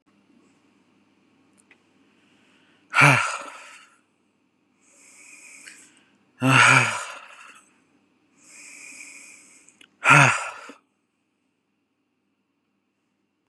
{
  "exhalation_length": "13.5 s",
  "exhalation_amplitude": 30840,
  "exhalation_signal_mean_std_ratio": 0.26,
  "survey_phase": "beta (2021-08-13 to 2022-03-07)",
  "age": "45-64",
  "gender": "Male",
  "wearing_mask": "No",
  "symptom_runny_or_blocked_nose": true,
  "symptom_headache": true,
  "symptom_onset": "6 days",
  "smoker_status": "Ex-smoker",
  "respiratory_condition_asthma": false,
  "respiratory_condition_other": false,
  "recruitment_source": "REACT",
  "submission_delay": "6 days",
  "covid_test_result": "Negative",
  "covid_test_method": "RT-qPCR",
  "influenza_a_test_result": "Negative",
  "influenza_b_test_result": "Negative"
}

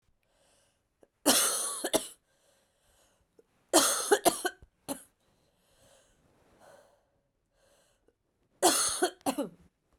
{
  "three_cough_length": "10.0 s",
  "three_cough_amplitude": 13601,
  "three_cough_signal_mean_std_ratio": 0.33,
  "survey_phase": "beta (2021-08-13 to 2022-03-07)",
  "age": "18-44",
  "gender": "Female",
  "wearing_mask": "No",
  "symptom_cough_any": true,
  "symptom_new_continuous_cough": true,
  "symptom_runny_or_blocked_nose": true,
  "symptom_shortness_of_breath": true,
  "symptom_sore_throat": true,
  "symptom_abdominal_pain": true,
  "symptom_fatigue": true,
  "symptom_headache": true,
  "smoker_status": "Never smoked",
  "respiratory_condition_asthma": false,
  "respiratory_condition_other": false,
  "recruitment_source": "Test and Trace",
  "submission_delay": "2 days",
  "covid_test_result": "Positive",
  "covid_test_method": "RT-qPCR",
  "covid_ct_value": 26.6,
  "covid_ct_gene": "ORF1ab gene",
  "covid_ct_mean": 27.4,
  "covid_viral_load": "1000 copies/ml",
  "covid_viral_load_category": "Minimal viral load (< 10K copies/ml)"
}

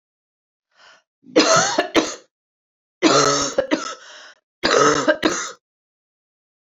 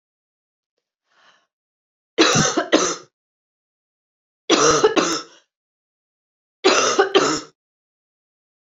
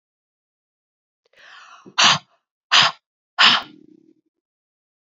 {
  "cough_length": "6.7 s",
  "cough_amplitude": 28483,
  "cough_signal_mean_std_ratio": 0.45,
  "three_cough_length": "8.7 s",
  "three_cough_amplitude": 28813,
  "three_cough_signal_mean_std_ratio": 0.38,
  "exhalation_length": "5.0 s",
  "exhalation_amplitude": 31674,
  "exhalation_signal_mean_std_ratio": 0.28,
  "survey_phase": "beta (2021-08-13 to 2022-03-07)",
  "age": "45-64",
  "gender": "Male",
  "wearing_mask": "No",
  "symptom_runny_or_blocked_nose": true,
  "symptom_headache": true,
  "symptom_change_to_sense_of_smell_or_taste": true,
  "symptom_other": true,
  "symptom_onset": "8 days",
  "smoker_status": "Never smoked",
  "respiratory_condition_asthma": false,
  "respiratory_condition_other": false,
  "recruitment_source": "Test and Trace",
  "submission_delay": "6 days",
  "covid_test_result": "Positive",
  "covid_test_method": "RT-qPCR"
}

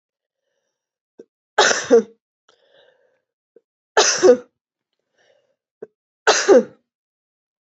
{
  "three_cough_length": "7.7 s",
  "three_cough_amplitude": 29411,
  "three_cough_signal_mean_std_ratio": 0.29,
  "survey_phase": "beta (2021-08-13 to 2022-03-07)",
  "age": "18-44",
  "gender": "Female",
  "wearing_mask": "No",
  "symptom_cough_any": true,
  "symptom_runny_or_blocked_nose": true,
  "symptom_headache": true,
  "symptom_onset": "3 days",
  "smoker_status": "Never smoked",
  "respiratory_condition_asthma": false,
  "respiratory_condition_other": false,
  "recruitment_source": "Test and Trace",
  "submission_delay": "2 days",
  "covid_test_result": "Positive",
  "covid_test_method": "RT-qPCR",
  "covid_ct_value": 15.9,
  "covid_ct_gene": "ORF1ab gene",
  "covid_ct_mean": 16.3,
  "covid_viral_load": "4400000 copies/ml",
  "covid_viral_load_category": "High viral load (>1M copies/ml)"
}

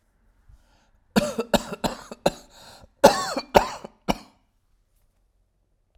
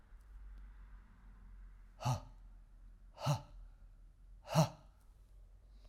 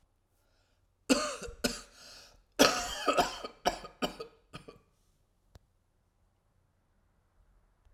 {
  "cough_length": "6.0 s",
  "cough_amplitude": 32768,
  "cough_signal_mean_std_ratio": 0.27,
  "exhalation_length": "5.9 s",
  "exhalation_amplitude": 4842,
  "exhalation_signal_mean_std_ratio": 0.39,
  "three_cough_length": "7.9 s",
  "three_cough_amplitude": 16595,
  "three_cough_signal_mean_std_ratio": 0.3,
  "survey_phase": "beta (2021-08-13 to 2022-03-07)",
  "age": "45-64",
  "gender": "Male",
  "wearing_mask": "No",
  "symptom_cough_any": true,
  "symptom_runny_or_blocked_nose": true,
  "symptom_shortness_of_breath": true,
  "symptom_sore_throat": true,
  "symptom_fatigue": true,
  "symptom_headache": true,
  "smoker_status": "Never smoked",
  "respiratory_condition_asthma": false,
  "respiratory_condition_other": false,
  "recruitment_source": "Test and Trace",
  "submission_delay": "-1 day",
  "covid_test_result": "Negative",
  "covid_test_method": "LFT"
}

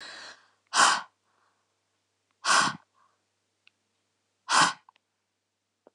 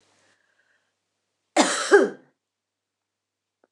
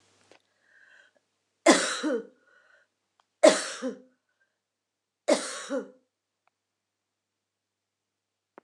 {
  "exhalation_length": "5.9 s",
  "exhalation_amplitude": 13247,
  "exhalation_signal_mean_std_ratio": 0.29,
  "cough_length": "3.7 s",
  "cough_amplitude": 24560,
  "cough_signal_mean_std_ratio": 0.26,
  "three_cough_length": "8.6 s",
  "three_cough_amplitude": 21555,
  "three_cough_signal_mean_std_ratio": 0.24,
  "survey_phase": "beta (2021-08-13 to 2022-03-07)",
  "age": "45-64",
  "gender": "Female",
  "wearing_mask": "No",
  "symptom_cough_any": true,
  "symptom_runny_or_blocked_nose": true,
  "symptom_shortness_of_breath": true,
  "symptom_abdominal_pain": true,
  "symptom_fatigue": true,
  "symptom_headache": true,
  "symptom_change_to_sense_of_smell_or_taste": true,
  "symptom_loss_of_taste": true,
  "symptom_onset": "5 days",
  "smoker_status": "Never smoked",
  "respiratory_condition_asthma": false,
  "respiratory_condition_other": false,
  "recruitment_source": "Test and Trace",
  "submission_delay": "2 days",
  "covid_test_result": "Positive",
  "covid_test_method": "LAMP"
}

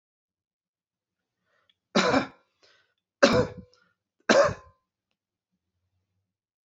{
  "three_cough_length": "6.7 s",
  "three_cough_amplitude": 23301,
  "three_cough_signal_mean_std_ratio": 0.26,
  "survey_phase": "beta (2021-08-13 to 2022-03-07)",
  "age": "45-64",
  "gender": "Male",
  "wearing_mask": "No",
  "symptom_fatigue": true,
  "symptom_onset": "12 days",
  "smoker_status": "Never smoked",
  "respiratory_condition_asthma": false,
  "respiratory_condition_other": false,
  "recruitment_source": "REACT",
  "submission_delay": "2 days",
  "covid_test_result": "Positive",
  "covid_test_method": "RT-qPCR",
  "covid_ct_value": 32.0,
  "covid_ct_gene": "N gene",
  "influenza_a_test_result": "Negative",
  "influenza_b_test_result": "Negative"
}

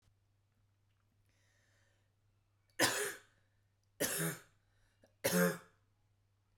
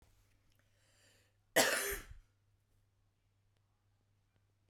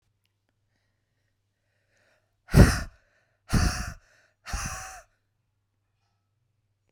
{
  "three_cough_length": "6.6 s",
  "three_cough_amplitude": 5155,
  "three_cough_signal_mean_std_ratio": 0.31,
  "cough_length": "4.7 s",
  "cough_amplitude": 5479,
  "cough_signal_mean_std_ratio": 0.24,
  "exhalation_length": "6.9 s",
  "exhalation_amplitude": 27513,
  "exhalation_signal_mean_std_ratio": 0.22,
  "survey_phase": "beta (2021-08-13 to 2022-03-07)",
  "age": "18-44",
  "gender": "Female",
  "wearing_mask": "No",
  "symptom_none": true,
  "smoker_status": "Never smoked",
  "respiratory_condition_asthma": false,
  "respiratory_condition_other": false,
  "recruitment_source": "REACT",
  "submission_delay": "1 day",
  "covid_test_result": "Negative",
  "covid_test_method": "RT-qPCR"
}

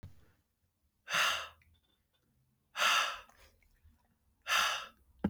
{
  "exhalation_length": "5.3 s",
  "exhalation_amplitude": 5578,
  "exhalation_signal_mean_std_ratio": 0.39,
  "survey_phase": "beta (2021-08-13 to 2022-03-07)",
  "age": "18-44",
  "gender": "Male",
  "wearing_mask": "No",
  "symptom_none": true,
  "symptom_onset": "13 days",
  "smoker_status": "Never smoked",
  "respiratory_condition_asthma": false,
  "respiratory_condition_other": false,
  "recruitment_source": "REACT",
  "submission_delay": "3 days",
  "covid_test_result": "Negative",
  "covid_test_method": "RT-qPCR",
  "influenza_a_test_result": "Negative",
  "influenza_b_test_result": "Negative"
}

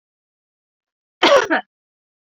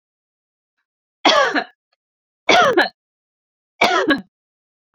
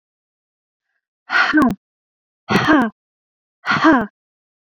{
  "cough_length": "2.4 s",
  "cough_amplitude": 29168,
  "cough_signal_mean_std_ratio": 0.29,
  "three_cough_length": "4.9 s",
  "three_cough_amplitude": 30164,
  "three_cough_signal_mean_std_ratio": 0.38,
  "exhalation_length": "4.7 s",
  "exhalation_amplitude": 29180,
  "exhalation_signal_mean_std_ratio": 0.41,
  "survey_phase": "beta (2021-08-13 to 2022-03-07)",
  "age": "45-64",
  "gender": "Female",
  "wearing_mask": "No",
  "symptom_none": true,
  "smoker_status": "Never smoked",
  "respiratory_condition_asthma": false,
  "respiratory_condition_other": false,
  "recruitment_source": "REACT",
  "submission_delay": "1 day",
  "covid_test_result": "Negative",
  "covid_test_method": "RT-qPCR"
}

